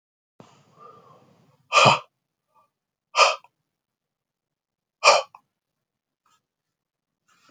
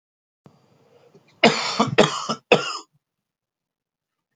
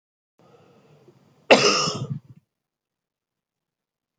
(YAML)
exhalation_length: 7.5 s
exhalation_amplitude: 27756
exhalation_signal_mean_std_ratio: 0.22
three_cough_length: 4.4 s
three_cough_amplitude: 29211
three_cough_signal_mean_std_ratio: 0.31
cough_length: 4.2 s
cough_amplitude: 29288
cough_signal_mean_std_ratio: 0.26
survey_phase: beta (2021-08-13 to 2022-03-07)
age: 45-64
gender: Male
wearing_mask: 'No'
symptom_cough_any: true
symptom_runny_or_blocked_nose: true
symptom_fatigue: true
symptom_fever_high_temperature: true
symptom_headache: true
symptom_onset: 3 days
smoker_status: Never smoked
respiratory_condition_asthma: true
respiratory_condition_other: false
recruitment_source: REACT
submission_delay: 1 day
covid_test_result: Positive
covid_test_method: RT-qPCR
covid_ct_value: 19.0
covid_ct_gene: E gene